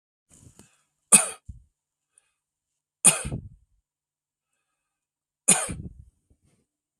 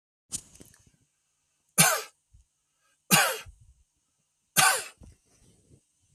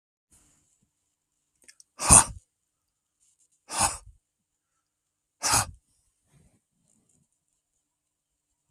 {"cough_length": "7.0 s", "cough_amplitude": 32768, "cough_signal_mean_std_ratio": 0.2, "three_cough_length": "6.1 s", "three_cough_amplitude": 18526, "three_cough_signal_mean_std_ratio": 0.28, "exhalation_length": "8.7 s", "exhalation_amplitude": 32048, "exhalation_signal_mean_std_ratio": 0.18, "survey_phase": "beta (2021-08-13 to 2022-03-07)", "age": "45-64", "gender": "Male", "wearing_mask": "No", "symptom_none": true, "smoker_status": "Never smoked", "respiratory_condition_asthma": false, "respiratory_condition_other": false, "recruitment_source": "REACT", "submission_delay": "3 days", "covid_test_result": "Negative", "covid_test_method": "RT-qPCR", "influenza_a_test_result": "Negative", "influenza_b_test_result": "Negative"}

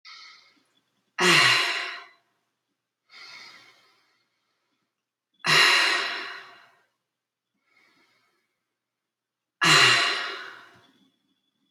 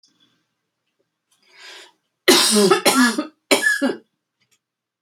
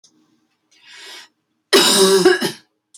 {"exhalation_length": "11.7 s", "exhalation_amplitude": 18200, "exhalation_signal_mean_std_ratio": 0.35, "three_cough_length": "5.0 s", "three_cough_amplitude": 32767, "three_cough_signal_mean_std_ratio": 0.41, "cough_length": "3.0 s", "cough_amplitude": 32282, "cough_signal_mean_std_ratio": 0.44, "survey_phase": "beta (2021-08-13 to 2022-03-07)", "age": "45-64", "gender": "Female", "wearing_mask": "No", "symptom_none": true, "smoker_status": "Current smoker (1 to 10 cigarettes per day)", "respiratory_condition_asthma": false, "respiratory_condition_other": false, "recruitment_source": "REACT", "submission_delay": "2 days", "covid_test_result": "Negative", "covid_test_method": "RT-qPCR"}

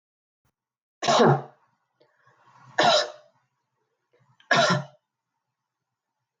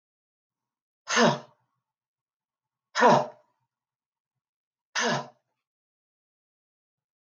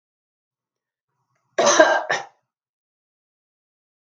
{"three_cough_length": "6.4 s", "three_cough_amplitude": 15880, "three_cough_signal_mean_std_ratio": 0.32, "exhalation_length": "7.3 s", "exhalation_amplitude": 16514, "exhalation_signal_mean_std_ratio": 0.25, "cough_length": "4.0 s", "cough_amplitude": 32264, "cough_signal_mean_std_ratio": 0.28, "survey_phase": "beta (2021-08-13 to 2022-03-07)", "age": "18-44", "gender": "Female", "wearing_mask": "No", "symptom_none": true, "smoker_status": "Ex-smoker", "respiratory_condition_asthma": false, "respiratory_condition_other": false, "recruitment_source": "REACT", "submission_delay": "1 day", "covid_test_result": "Negative", "covid_test_method": "RT-qPCR"}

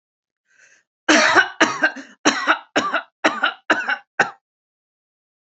{"three_cough_length": "5.5 s", "three_cough_amplitude": 30599, "three_cough_signal_mean_std_ratio": 0.43, "survey_phase": "beta (2021-08-13 to 2022-03-07)", "age": "45-64", "gender": "Female", "wearing_mask": "No", "symptom_none": true, "smoker_status": "Never smoked", "respiratory_condition_asthma": false, "respiratory_condition_other": false, "recruitment_source": "REACT", "submission_delay": "2 days", "covid_test_result": "Negative", "covid_test_method": "RT-qPCR", "influenza_a_test_result": "Negative", "influenza_b_test_result": "Negative"}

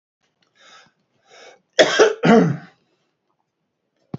{"cough_length": "4.2 s", "cough_amplitude": 27862, "cough_signal_mean_std_ratio": 0.31, "survey_phase": "beta (2021-08-13 to 2022-03-07)", "age": "65+", "gender": "Male", "wearing_mask": "No", "symptom_none": true, "smoker_status": "Ex-smoker", "respiratory_condition_asthma": false, "respiratory_condition_other": false, "recruitment_source": "REACT", "submission_delay": "2 days", "covid_test_result": "Negative", "covid_test_method": "RT-qPCR", "influenza_a_test_result": "Negative", "influenza_b_test_result": "Negative"}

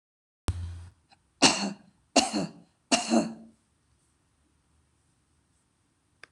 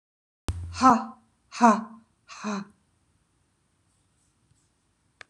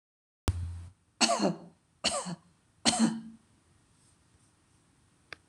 {"three_cough_length": "6.3 s", "three_cough_amplitude": 18310, "three_cough_signal_mean_std_ratio": 0.31, "exhalation_length": "5.3 s", "exhalation_amplitude": 21591, "exhalation_signal_mean_std_ratio": 0.27, "cough_length": "5.5 s", "cough_amplitude": 11169, "cough_signal_mean_std_ratio": 0.37, "survey_phase": "beta (2021-08-13 to 2022-03-07)", "age": "65+", "gender": "Female", "wearing_mask": "No", "symptom_none": true, "smoker_status": "Ex-smoker", "respiratory_condition_asthma": false, "respiratory_condition_other": false, "recruitment_source": "REACT", "submission_delay": "0 days", "covid_test_result": "Negative", "covid_test_method": "RT-qPCR"}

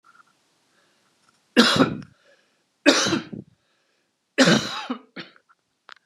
{"three_cough_length": "6.1 s", "three_cough_amplitude": 32582, "three_cough_signal_mean_std_ratio": 0.33, "survey_phase": "beta (2021-08-13 to 2022-03-07)", "age": "45-64", "gender": "Male", "wearing_mask": "No", "symptom_cough_any": true, "symptom_runny_or_blocked_nose": true, "symptom_fatigue": true, "symptom_headache": true, "smoker_status": "Never smoked", "respiratory_condition_asthma": false, "respiratory_condition_other": false, "recruitment_source": "Test and Trace", "submission_delay": "2 days", "covid_test_result": "Positive", "covid_test_method": "RT-qPCR", "covid_ct_value": 22.2, "covid_ct_gene": "ORF1ab gene", "covid_ct_mean": 23.3, "covid_viral_load": "22000 copies/ml", "covid_viral_load_category": "Low viral load (10K-1M copies/ml)"}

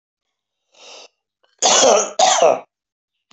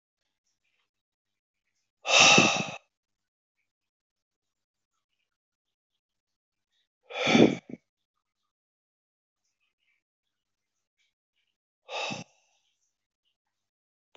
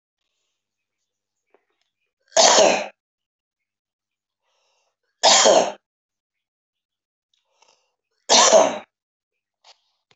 {"cough_length": "3.3 s", "cough_amplitude": 27315, "cough_signal_mean_std_ratio": 0.43, "exhalation_length": "14.2 s", "exhalation_amplitude": 19525, "exhalation_signal_mean_std_ratio": 0.2, "three_cough_length": "10.2 s", "three_cough_amplitude": 28683, "three_cough_signal_mean_std_ratio": 0.29, "survey_phase": "beta (2021-08-13 to 2022-03-07)", "age": "45-64", "gender": "Male", "wearing_mask": "No", "symptom_none": true, "smoker_status": "Current smoker (11 or more cigarettes per day)", "respiratory_condition_asthma": false, "respiratory_condition_other": false, "recruitment_source": "REACT", "submission_delay": "1 day", "covid_test_result": "Negative", "covid_test_method": "RT-qPCR", "influenza_a_test_result": "Negative", "influenza_b_test_result": "Negative"}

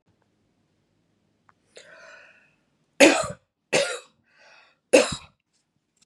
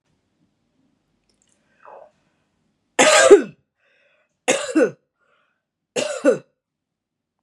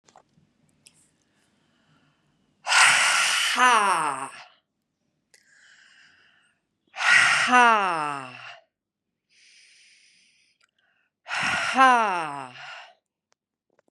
{"three_cough_length": "6.1 s", "three_cough_amplitude": 30654, "three_cough_signal_mean_std_ratio": 0.24, "cough_length": "7.4 s", "cough_amplitude": 32768, "cough_signal_mean_std_ratio": 0.27, "exhalation_length": "13.9 s", "exhalation_amplitude": 26979, "exhalation_signal_mean_std_ratio": 0.39, "survey_phase": "beta (2021-08-13 to 2022-03-07)", "age": "45-64", "gender": "Female", "wearing_mask": "No", "symptom_none": true, "smoker_status": "Never smoked", "respiratory_condition_asthma": false, "respiratory_condition_other": false, "recruitment_source": "REACT", "submission_delay": "1 day", "covid_test_result": "Negative", "covid_test_method": "RT-qPCR", "influenza_a_test_result": "Negative", "influenza_b_test_result": "Negative"}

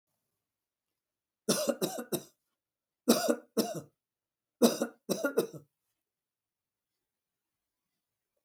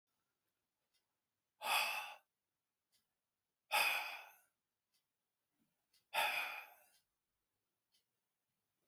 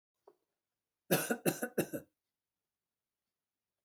{"three_cough_length": "8.4 s", "three_cough_amplitude": 10389, "three_cough_signal_mean_std_ratio": 0.3, "exhalation_length": "8.9 s", "exhalation_amplitude": 2300, "exhalation_signal_mean_std_ratio": 0.31, "cough_length": "3.8 s", "cough_amplitude": 5296, "cough_signal_mean_std_ratio": 0.28, "survey_phase": "beta (2021-08-13 to 2022-03-07)", "age": "65+", "gender": "Male", "wearing_mask": "No", "symptom_none": true, "smoker_status": "Ex-smoker", "respiratory_condition_asthma": false, "respiratory_condition_other": false, "recruitment_source": "REACT", "submission_delay": "1 day", "covid_test_result": "Negative", "covid_test_method": "RT-qPCR", "influenza_a_test_result": "Negative", "influenza_b_test_result": "Negative"}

